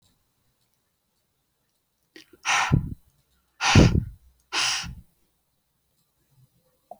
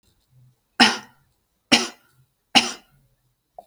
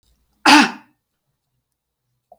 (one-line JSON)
{"exhalation_length": "7.0 s", "exhalation_amplitude": 24085, "exhalation_signal_mean_std_ratio": 0.29, "three_cough_length": "3.7 s", "three_cough_amplitude": 32768, "three_cough_signal_mean_std_ratio": 0.25, "cough_length": "2.4 s", "cough_amplitude": 32768, "cough_signal_mean_std_ratio": 0.26, "survey_phase": "alpha (2021-03-01 to 2021-08-12)", "age": "45-64", "gender": "Female", "wearing_mask": "No", "symptom_none": true, "symptom_onset": "7 days", "smoker_status": "Never smoked", "respiratory_condition_asthma": false, "respiratory_condition_other": false, "recruitment_source": "REACT", "submission_delay": "21 days", "covid_test_result": "Negative", "covid_test_method": "RT-qPCR"}